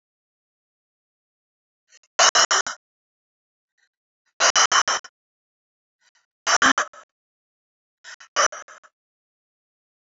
exhalation_length: 10.1 s
exhalation_amplitude: 26507
exhalation_signal_mean_std_ratio: 0.27
survey_phase: alpha (2021-03-01 to 2021-08-12)
age: 18-44
gender: Female
wearing_mask: 'No'
symptom_new_continuous_cough: true
symptom_fatigue: true
smoker_status: Never smoked
respiratory_condition_asthma: true
respiratory_condition_other: false
recruitment_source: Test and Trace
submission_delay: 1 day
covid_test_result: Positive
covid_test_method: RT-qPCR
covid_ct_value: 22.2
covid_ct_gene: ORF1ab gene
covid_ct_mean: 23.4
covid_viral_load: 21000 copies/ml
covid_viral_load_category: Low viral load (10K-1M copies/ml)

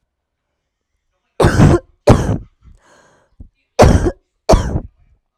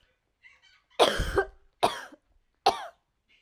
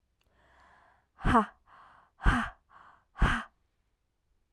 cough_length: 5.4 s
cough_amplitude: 32768
cough_signal_mean_std_ratio: 0.38
three_cough_length: 3.4 s
three_cough_amplitude: 15750
three_cough_signal_mean_std_ratio: 0.33
exhalation_length: 4.5 s
exhalation_amplitude: 9871
exhalation_signal_mean_std_ratio: 0.31
survey_phase: alpha (2021-03-01 to 2021-08-12)
age: 18-44
gender: Female
wearing_mask: 'No'
symptom_cough_any: true
symptom_shortness_of_breath: true
symptom_fatigue: true
symptom_headache: true
symptom_change_to_sense_of_smell_or_taste: true
symptom_loss_of_taste: true
symptom_onset: 4 days
smoker_status: Ex-smoker
respiratory_condition_asthma: false
respiratory_condition_other: false
recruitment_source: Test and Trace
submission_delay: 2 days
covid_test_result: Positive
covid_test_method: RT-qPCR
covid_ct_value: 22.6
covid_ct_gene: ORF1ab gene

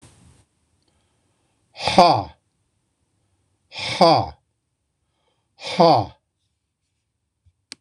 exhalation_length: 7.8 s
exhalation_amplitude: 26028
exhalation_signal_mean_std_ratio: 0.28
survey_phase: beta (2021-08-13 to 2022-03-07)
age: 65+
gender: Male
wearing_mask: 'No'
symptom_none: true
smoker_status: Ex-smoker
respiratory_condition_asthma: false
respiratory_condition_other: false
recruitment_source: REACT
submission_delay: 0 days
covid_test_result: Negative
covid_test_method: RT-qPCR
influenza_a_test_result: Negative
influenza_b_test_result: Negative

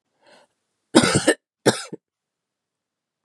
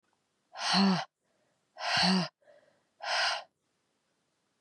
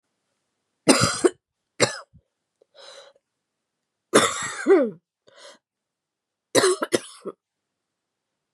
cough_length: 3.2 s
cough_amplitude: 32467
cough_signal_mean_std_ratio: 0.27
exhalation_length: 4.6 s
exhalation_amplitude: 5995
exhalation_signal_mean_std_ratio: 0.44
three_cough_length: 8.5 s
three_cough_amplitude: 31768
three_cough_signal_mean_std_ratio: 0.3
survey_phase: beta (2021-08-13 to 2022-03-07)
age: 18-44
gender: Female
wearing_mask: 'No'
symptom_none: true
smoker_status: Never smoked
respiratory_condition_asthma: false
respiratory_condition_other: false
recruitment_source: REACT
submission_delay: 2 days
covid_test_result: Negative
covid_test_method: RT-qPCR
influenza_a_test_result: Negative
influenza_b_test_result: Negative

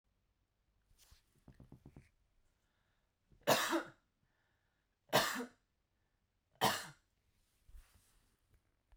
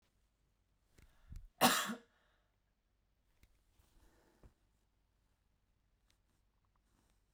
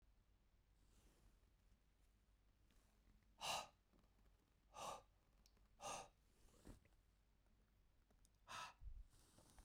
three_cough_length: 9.0 s
three_cough_amplitude: 4282
three_cough_signal_mean_std_ratio: 0.25
cough_length: 7.3 s
cough_amplitude: 5124
cough_signal_mean_std_ratio: 0.18
exhalation_length: 9.6 s
exhalation_amplitude: 689
exhalation_signal_mean_std_ratio: 0.42
survey_phase: beta (2021-08-13 to 2022-03-07)
age: 45-64
gender: Female
wearing_mask: 'No'
symptom_runny_or_blocked_nose: true
symptom_other: true
symptom_onset: 11 days
smoker_status: Never smoked
respiratory_condition_asthma: false
respiratory_condition_other: false
recruitment_source: REACT
submission_delay: 1 day
covid_test_result: Negative
covid_test_method: RT-qPCR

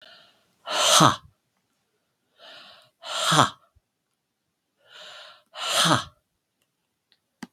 exhalation_length: 7.5 s
exhalation_amplitude: 32768
exhalation_signal_mean_std_ratio: 0.31
survey_phase: beta (2021-08-13 to 2022-03-07)
age: 65+
gender: Male
wearing_mask: 'No'
symptom_runny_or_blocked_nose: true
symptom_onset: 9 days
smoker_status: Ex-smoker
respiratory_condition_asthma: false
respiratory_condition_other: false
recruitment_source: REACT
submission_delay: 1 day
covid_test_result: Negative
covid_test_method: RT-qPCR
influenza_a_test_result: Negative
influenza_b_test_result: Negative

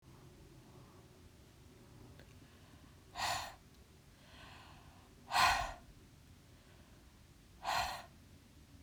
exhalation_length: 8.8 s
exhalation_amplitude: 4459
exhalation_signal_mean_std_ratio: 0.37
survey_phase: beta (2021-08-13 to 2022-03-07)
age: 45-64
gender: Female
wearing_mask: 'No'
symptom_none: true
smoker_status: Ex-smoker
respiratory_condition_asthma: false
respiratory_condition_other: false
recruitment_source: REACT
submission_delay: 1 day
covid_test_result: Negative
covid_test_method: RT-qPCR
covid_ct_value: 37.0
covid_ct_gene: N gene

